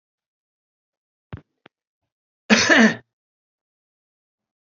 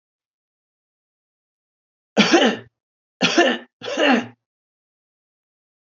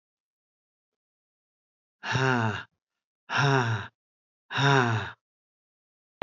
cough_length: 4.6 s
cough_amplitude: 28188
cough_signal_mean_std_ratio: 0.24
three_cough_length: 6.0 s
three_cough_amplitude: 27322
three_cough_signal_mean_std_ratio: 0.33
exhalation_length: 6.2 s
exhalation_amplitude: 15217
exhalation_signal_mean_std_ratio: 0.4
survey_phase: beta (2021-08-13 to 2022-03-07)
age: 45-64
gender: Male
wearing_mask: 'No'
symptom_fatigue: true
smoker_status: Never smoked
respiratory_condition_asthma: false
respiratory_condition_other: false
recruitment_source: REACT
submission_delay: 2 days
covid_test_result: Negative
covid_test_method: RT-qPCR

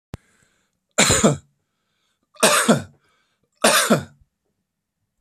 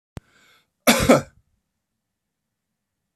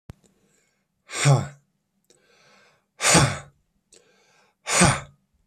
three_cough_length: 5.2 s
three_cough_amplitude: 32767
three_cough_signal_mean_std_ratio: 0.37
cough_length: 3.2 s
cough_amplitude: 30161
cough_signal_mean_std_ratio: 0.24
exhalation_length: 5.5 s
exhalation_amplitude: 25506
exhalation_signal_mean_std_ratio: 0.33
survey_phase: beta (2021-08-13 to 2022-03-07)
age: 45-64
gender: Male
wearing_mask: 'No'
symptom_other: true
symptom_onset: 12 days
smoker_status: Ex-smoker
respiratory_condition_asthma: false
respiratory_condition_other: false
recruitment_source: REACT
submission_delay: 1 day
covid_test_result: Negative
covid_test_method: RT-qPCR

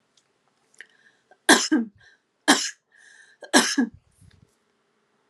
three_cough_length: 5.3 s
three_cough_amplitude: 29739
three_cough_signal_mean_std_ratio: 0.29
survey_phase: alpha (2021-03-01 to 2021-08-12)
age: 18-44
gender: Female
wearing_mask: 'No'
symptom_none: true
smoker_status: Never smoked
respiratory_condition_asthma: false
respiratory_condition_other: false
recruitment_source: REACT
submission_delay: 1 day
covid_test_result: Negative
covid_test_method: RT-qPCR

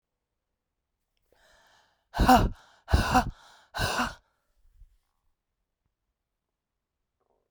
exhalation_length: 7.5 s
exhalation_amplitude: 15272
exhalation_signal_mean_std_ratio: 0.27
survey_phase: beta (2021-08-13 to 2022-03-07)
age: 45-64
gender: Female
wearing_mask: 'No'
symptom_cough_any: true
symptom_runny_or_blocked_nose: true
symptom_shortness_of_breath: true
symptom_fatigue: true
symptom_headache: true
symptom_change_to_sense_of_smell_or_taste: true
symptom_loss_of_taste: true
symptom_onset: 5 days
smoker_status: Current smoker (1 to 10 cigarettes per day)
respiratory_condition_asthma: false
respiratory_condition_other: false
recruitment_source: Test and Trace
submission_delay: 1 day
covid_test_result: Positive
covid_test_method: RT-qPCR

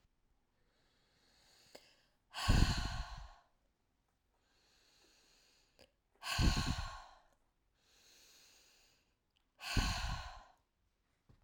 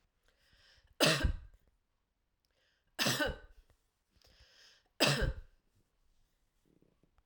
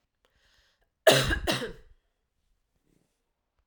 exhalation_length: 11.4 s
exhalation_amplitude: 6215
exhalation_signal_mean_std_ratio: 0.32
three_cough_length: 7.3 s
three_cough_amplitude: 7743
three_cough_signal_mean_std_ratio: 0.31
cough_length: 3.7 s
cough_amplitude: 18747
cough_signal_mean_std_ratio: 0.27
survey_phase: alpha (2021-03-01 to 2021-08-12)
age: 45-64
gender: Female
wearing_mask: 'No'
symptom_none: true
smoker_status: Never smoked
respiratory_condition_asthma: false
respiratory_condition_other: false
recruitment_source: REACT
submission_delay: 1 day
covid_test_result: Negative
covid_test_method: RT-qPCR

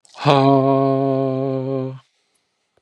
exhalation_length: 2.8 s
exhalation_amplitude: 32767
exhalation_signal_mean_std_ratio: 0.58
survey_phase: beta (2021-08-13 to 2022-03-07)
age: 18-44
gender: Male
wearing_mask: 'Yes'
symptom_cough_any: true
symptom_new_continuous_cough: true
symptom_sore_throat: true
symptom_fatigue: true
symptom_headache: true
symptom_onset: 6 days
smoker_status: Never smoked
respiratory_condition_asthma: false
respiratory_condition_other: false
recruitment_source: Test and Trace
submission_delay: 2 days
covid_test_result: Positive
covid_test_method: ePCR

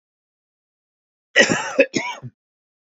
cough_length: 2.8 s
cough_amplitude: 28927
cough_signal_mean_std_ratio: 0.32
survey_phase: beta (2021-08-13 to 2022-03-07)
age: 45-64
gender: Male
wearing_mask: 'No'
symptom_none: true
symptom_onset: 7 days
smoker_status: Ex-smoker
respiratory_condition_asthma: true
respiratory_condition_other: false
recruitment_source: REACT
submission_delay: 1 day
covid_test_result: Negative
covid_test_method: RT-qPCR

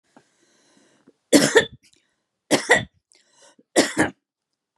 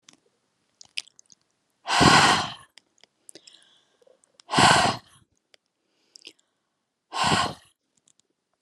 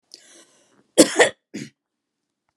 three_cough_length: 4.8 s
three_cough_amplitude: 31549
three_cough_signal_mean_std_ratio: 0.3
exhalation_length: 8.6 s
exhalation_amplitude: 27759
exhalation_signal_mean_std_ratio: 0.31
cough_length: 2.6 s
cough_amplitude: 32767
cough_signal_mean_std_ratio: 0.23
survey_phase: beta (2021-08-13 to 2022-03-07)
age: 65+
gender: Female
wearing_mask: 'No'
symptom_none: true
smoker_status: Never smoked
respiratory_condition_asthma: false
respiratory_condition_other: false
recruitment_source: REACT
submission_delay: 2 days
covid_test_result: Negative
covid_test_method: RT-qPCR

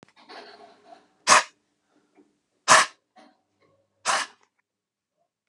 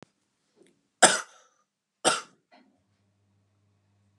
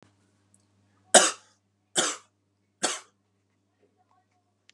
exhalation_length: 5.5 s
exhalation_amplitude: 30226
exhalation_signal_mean_std_ratio: 0.23
cough_length: 4.2 s
cough_amplitude: 26871
cough_signal_mean_std_ratio: 0.19
three_cough_length: 4.7 s
three_cough_amplitude: 29704
three_cough_signal_mean_std_ratio: 0.2
survey_phase: beta (2021-08-13 to 2022-03-07)
age: 45-64
gender: Male
wearing_mask: 'No'
symptom_sore_throat: true
smoker_status: Never smoked
respiratory_condition_asthma: false
respiratory_condition_other: false
recruitment_source: Test and Trace
submission_delay: 1 day
covid_test_result: Positive
covid_test_method: RT-qPCR
covid_ct_value: 21.5
covid_ct_gene: ORF1ab gene
covid_ct_mean: 24.4
covid_viral_load: 10000 copies/ml
covid_viral_load_category: Low viral load (10K-1M copies/ml)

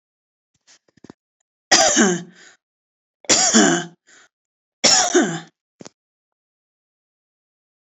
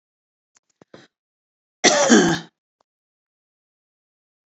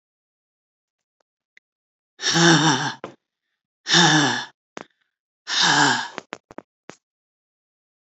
three_cough_length: 7.9 s
three_cough_amplitude: 32768
three_cough_signal_mean_std_ratio: 0.35
cough_length: 4.5 s
cough_amplitude: 30643
cough_signal_mean_std_ratio: 0.27
exhalation_length: 8.1 s
exhalation_amplitude: 25599
exhalation_signal_mean_std_ratio: 0.38
survey_phase: alpha (2021-03-01 to 2021-08-12)
age: 65+
gender: Female
wearing_mask: 'No'
symptom_none: true
smoker_status: Never smoked
respiratory_condition_asthma: false
respiratory_condition_other: false
recruitment_source: REACT
submission_delay: 6 days
covid_test_result: Negative
covid_test_method: RT-qPCR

